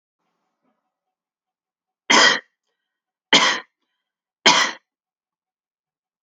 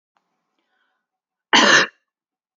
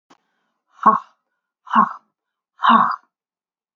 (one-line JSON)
{"three_cough_length": "6.2 s", "three_cough_amplitude": 31449, "three_cough_signal_mean_std_ratio": 0.27, "cough_length": "2.6 s", "cough_amplitude": 30047, "cough_signal_mean_std_ratio": 0.29, "exhalation_length": "3.8 s", "exhalation_amplitude": 27649, "exhalation_signal_mean_std_ratio": 0.32, "survey_phase": "alpha (2021-03-01 to 2021-08-12)", "age": "65+", "gender": "Female", "wearing_mask": "No", "symptom_none": true, "smoker_status": "Never smoked", "respiratory_condition_asthma": false, "respiratory_condition_other": false, "recruitment_source": "REACT", "submission_delay": "6 days", "covid_test_result": "Negative", "covid_test_method": "RT-qPCR"}